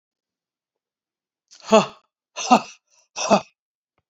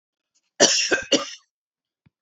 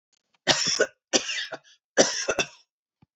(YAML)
exhalation_length: 4.1 s
exhalation_amplitude: 27368
exhalation_signal_mean_std_ratio: 0.25
cough_length: 2.2 s
cough_amplitude: 32767
cough_signal_mean_std_ratio: 0.37
three_cough_length: 3.2 s
three_cough_amplitude: 25823
three_cough_signal_mean_std_ratio: 0.42
survey_phase: beta (2021-08-13 to 2022-03-07)
age: 65+
gender: Female
wearing_mask: 'No'
symptom_none: true
smoker_status: Never smoked
respiratory_condition_asthma: false
respiratory_condition_other: false
recruitment_source: REACT
submission_delay: 2 days
covid_test_result: Negative
covid_test_method: RT-qPCR